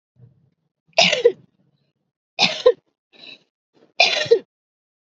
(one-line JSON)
{"three_cough_length": "5.0 s", "three_cough_amplitude": 32768, "three_cough_signal_mean_std_ratio": 0.31, "survey_phase": "beta (2021-08-13 to 2022-03-07)", "age": "18-44", "gender": "Female", "wearing_mask": "No", "symptom_none": true, "smoker_status": "Never smoked", "respiratory_condition_asthma": false, "respiratory_condition_other": false, "recruitment_source": "REACT", "submission_delay": "9 days", "covid_test_result": "Negative", "covid_test_method": "RT-qPCR"}